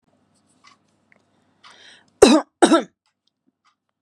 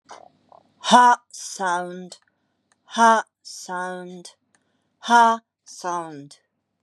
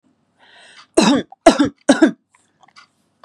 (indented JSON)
{
  "cough_length": "4.0 s",
  "cough_amplitude": 32768,
  "cough_signal_mean_std_ratio": 0.24,
  "exhalation_length": "6.8 s",
  "exhalation_amplitude": 31778,
  "exhalation_signal_mean_std_ratio": 0.37,
  "three_cough_length": "3.2 s",
  "three_cough_amplitude": 32768,
  "three_cough_signal_mean_std_ratio": 0.34,
  "survey_phase": "beta (2021-08-13 to 2022-03-07)",
  "age": "45-64",
  "gender": "Female",
  "wearing_mask": "No",
  "symptom_prefer_not_to_say": true,
  "smoker_status": "Never smoked",
  "recruitment_source": "REACT",
  "submission_delay": "4 days",
  "covid_test_result": "Negative",
  "covid_test_method": "RT-qPCR",
  "influenza_a_test_result": "Negative",
  "influenza_b_test_result": "Negative"
}